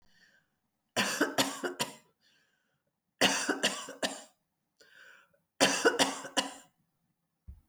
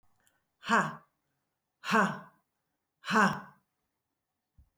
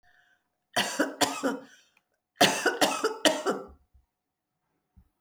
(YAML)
three_cough_length: 7.7 s
three_cough_amplitude: 14207
three_cough_signal_mean_std_ratio: 0.39
exhalation_length: 4.8 s
exhalation_amplitude: 8035
exhalation_signal_mean_std_ratio: 0.32
cough_length: 5.2 s
cough_amplitude: 20871
cough_signal_mean_std_ratio: 0.41
survey_phase: alpha (2021-03-01 to 2021-08-12)
age: 45-64
gender: Female
wearing_mask: 'No'
symptom_none: true
smoker_status: Ex-smoker
respiratory_condition_asthma: false
respiratory_condition_other: false
recruitment_source: REACT
submission_delay: 2 days
covid_test_result: Negative
covid_test_method: RT-qPCR